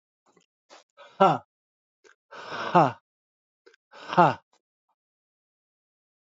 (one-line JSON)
{"exhalation_length": "6.3 s", "exhalation_amplitude": 23701, "exhalation_signal_mean_std_ratio": 0.23, "survey_phase": "alpha (2021-03-01 to 2021-08-12)", "age": "18-44", "gender": "Male", "wearing_mask": "No", "symptom_cough_any": true, "symptom_onset": "8 days", "smoker_status": "Never smoked", "respiratory_condition_asthma": false, "respiratory_condition_other": true, "recruitment_source": "REACT", "submission_delay": "1 day", "covid_test_result": "Negative", "covid_test_method": "RT-qPCR"}